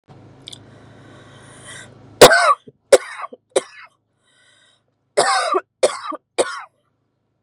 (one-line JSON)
{"three_cough_length": "7.4 s", "three_cough_amplitude": 32768, "three_cough_signal_mean_std_ratio": 0.29, "survey_phase": "beta (2021-08-13 to 2022-03-07)", "age": "18-44", "gender": "Female", "wearing_mask": "No", "symptom_none": true, "smoker_status": "Current smoker (e-cigarettes or vapes only)", "respiratory_condition_asthma": false, "respiratory_condition_other": false, "recruitment_source": "REACT", "submission_delay": "0 days", "covid_test_result": "Negative", "covid_test_method": "RT-qPCR", "influenza_a_test_result": "Negative", "influenza_b_test_result": "Negative"}